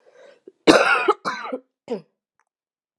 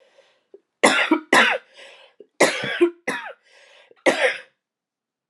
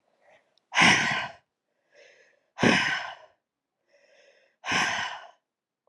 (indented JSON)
{
  "cough_length": "3.0 s",
  "cough_amplitude": 32767,
  "cough_signal_mean_std_ratio": 0.35,
  "three_cough_length": "5.3 s",
  "three_cough_amplitude": 32285,
  "three_cough_signal_mean_std_ratio": 0.4,
  "exhalation_length": "5.9 s",
  "exhalation_amplitude": 15303,
  "exhalation_signal_mean_std_ratio": 0.38,
  "survey_phase": "alpha (2021-03-01 to 2021-08-12)",
  "age": "18-44",
  "gender": "Female",
  "wearing_mask": "No",
  "symptom_cough_any": true,
  "symptom_fatigue": true,
  "symptom_headache": true,
  "symptom_loss_of_taste": true,
  "symptom_onset": "5 days",
  "smoker_status": "Current smoker (1 to 10 cigarettes per day)",
  "respiratory_condition_asthma": false,
  "respiratory_condition_other": false,
  "recruitment_source": "Test and Trace",
  "submission_delay": "2 days",
  "covid_test_result": "Positive",
  "covid_test_method": "RT-qPCR",
  "covid_ct_value": 23.2,
  "covid_ct_gene": "ORF1ab gene",
  "covid_ct_mean": 23.7,
  "covid_viral_load": "17000 copies/ml",
  "covid_viral_load_category": "Low viral load (10K-1M copies/ml)"
}